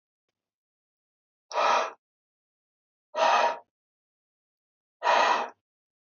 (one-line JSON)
{"exhalation_length": "6.1 s", "exhalation_amplitude": 10496, "exhalation_signal_mean_std_ratio": 0.35, "survey_phase": "beta (2021-08-13 to 2022-03-07)", "age": "18-44", "gender": "Male", "wearing_mask": "No", "symptom_cough_any": true, "symptom_runny_or_blocked_nose": true, "symptom_fever_high_temperature": true, "symptom_change_to_sense_of_smell_or_taste": true, "symptom_loss_of_taste": true, "symptom_onset": "4 days", "smoker_status": "Never smoked", "respiratory_condition_asthma": false, "respiratory_condition_other": false, "recruitment_source": "Test and Trace", "submission_delay": "2 days", "covid_test_result": "Positive", "covid_test_method": "RT-qPCR"}